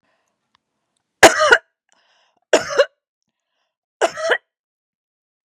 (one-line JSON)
{"three_cough_length": "5.5 s", "three_cough_amplitude": 32768, "three_cough_signal_mean_std_ratio": 0.26, "survey_phase": "beta (2021-08-13 to 2022-03-07)", "age": "45-64", "gender": "Female", "wearing_mask": "No", "symptom_none": true, "smoker_status": "Never smoked", "respiratory_condition_asthma": false, "respiratory_condition_other": false, "recruitment_source": "REACT", "submission_delay": "1 day", "covid_test_result": "Negative", "covid_test_method": "RT-qPCR", "influenza_a_test_result": "Negative", "influenza_b_test_result": "Negative"}